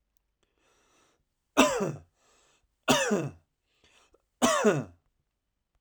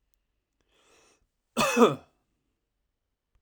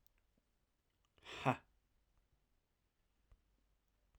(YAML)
three_cough_length: 5.8 s
three_cough_amplitude: 15798
three_cough_signal_mean_std_ratio: 0.35
cough_length: 3.4 s
cough_amplitude: 16740
cough_signal_mean_std_ratio: 0.24
exhalation_length: 4.2 s
exhalation_amplitude: 2850
exhalation_signal_mean_std_ratio: 0.17
survey_phase: alpha (2021-03-01 to 2021-08-12)
age: 18-44
gender: Male
wearing_mask: 'No'
symptom_headache: true
smoker_status: Current smoker (e-cigarettes or vapes only)
respiratory_condition_asthma: false
respiratory_condition_other: false
recruitment_source: Test and Trace
submission_delay: 2 days
covid_test_result: Positive
covid_test_method: RT-qPCR
covid_ct_value: 25.6
covid_ct_gene: N gene
covid_ct_mean: 25.9
covid_viral_load: 3300 copies/ml
covid_viral_load_category: Minimal viral load (< 10K copies/ml)